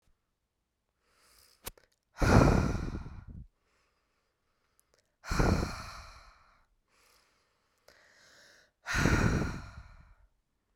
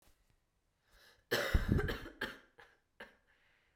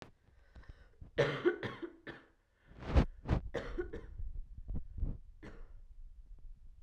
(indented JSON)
{
  "exhalation_length": "10.8 s",
  "exhalation_amplitude": 11645,
  "exhalation_signal_mean_std_ratio": 0.34,
  "cough_length": "3.8 s",
  "cough_amplitude": 4617,
  "cough_signal_mean_std_ratio": 0.35,
  "three_cough_length": "6.8 s",
  "three_cough_amplitude": 5791,
  "three_cough_signal_mean_std_ratio": 0.49,
  "survey_phase": "beta (2021-08-13 to 2022-03-07)",
  "age": "18-44",
  "gender": "Female",
  "wearing_mask": "No",
  "symptom_cough_any": true,
  "symptom_runny_or_blocked_nose": true,
  "symptom_fatigue": true,
  "symptom_headache": true,
  "symptom_other": true,
  "smoker_status": "Current smoker (1 to 10 cigarettes per day)",
  "respiratory_condition_asthma": false,
  "respiratory_condition_other": false,
  "recruitment_source": "Test and Trace",
  "submission_delay": "0 days",
  "covid_test_result": "Positive",
  "covid_test_method": "RT-qPCR",
  "covid_ct_value": 17.2,
  "covid_ct_gene": "ORF1ab gene",
  "covid_ct_mean": 17.8,
  "covid_viral_load": "1500000 copies/ml",
  "covid_viral_load_category": "High viral load (>1M copies/ml)"
}